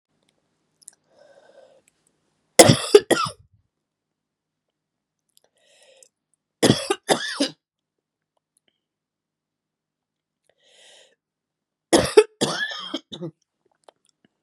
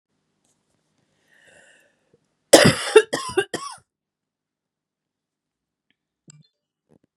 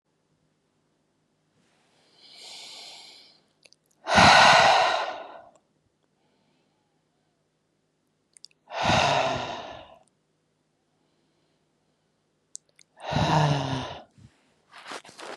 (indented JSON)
{
  "three_cough_length": "14.4 s",
  "three_cough_amplitude": 32768,
  "three_cough_signal_mean_std_ratio": 0.21,
  "cough_length": "7.2 s",
  "cough_amplitude": 32768,
  "cough_signal_mean_std_ratio": 0.2,
  "exhalation_length": "15.4 s",
  "exhalation_amplitude": 22701,
  "exhalation_signal_mean_std_ratio": 0.32,
  "survey_phase": "beta (2021-08-13 to 2022-03-07)",
  "age": "18-44",
  "gender": "Female",
  "wearing_mask": "No",
  "symptom_shortness_of_breath": true,
  "symptom_fatigue": true,
  "smoker_status": "Ex-smoker",
  "respiratory_condition_asthma": false,
  "respiratory_condition_other": false,
  "recruitment_source": "Test and Trace",
  "submission_delay": "2 days",
  "covid_test_result": "Positive",
  "covid_test_method": "RT-qPCR",
  "covid_ct_value": 22.0,
  "covid_ct_gene": "ORF1ab gene",
  "covid_ct_mean": 22.4,
  "covid_viral_load": "46000 copies/ml",
  "covid_viral_load_category": "Low viral load (10K-1M copies/ml)"
}